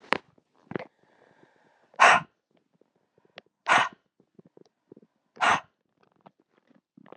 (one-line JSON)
{"exhalation_length": "7.2 s", "exhalation_amplitude": 24062, "exhalation_signal_mean_std_ratio": 0.23, "survey_phase": "beta (2021-08-13 to 2022-03-07)", "age": "18-44", "gender": "Female", "wearing_mask": "No", "symptom_cough_any": true, "symptom_runny_or_blocked_nose": true, "symptom_fatigue": true, "symptom_headache": true, "symptom_change_to_sense_of_smell_or_taste": true, "symptom_loss_of_taste": true, "smoker_status": "Never smoked", "respiratory_condition_asthma": false, "respiratory_condition_other": false, "recruitment_source": "Test and Trace", "submission_delay": "3 days", "covid_test_result": "Positive", "covid_test_method": "LFT"}